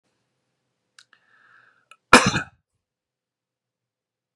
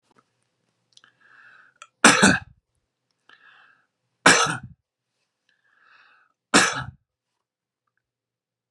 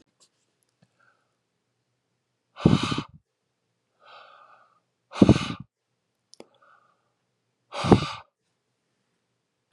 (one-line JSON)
{"cough_length": "4.4 s", "cough_amplitude": 32768, "cough_signal_mean_std_ratio": 0.16, "three_cough_length": "8.7 s", "three_cough_amplitude": 32767, "three_cough_signal_mean_std_ratio": 0.24, "exhalation_length": "9.7 s", "exhalation_amplitude": 31193, "exhalation_signal_mean_std_ratio": 0.2, "survey_phase": "beta (2021-08-13 to 2022-03-07)", "age": "18-44", "gender": "Male", "wearing_mask": "No", "symptom_none": true, "smoker_status": "Never smoked", "respiratory_condition_asthma": false, "respiratory_condition_other": false, "recruitment_source": "REACT", "submission_delay": "3 days", "covid_test_result": "Negative", "covid_test_method": "RT-qPCR", "covid_ct_value": 39.0, "covid_ct_gene": "N gene", "influenza_a_test_result": "Negative", "influenza_b_test_result": "Negative"}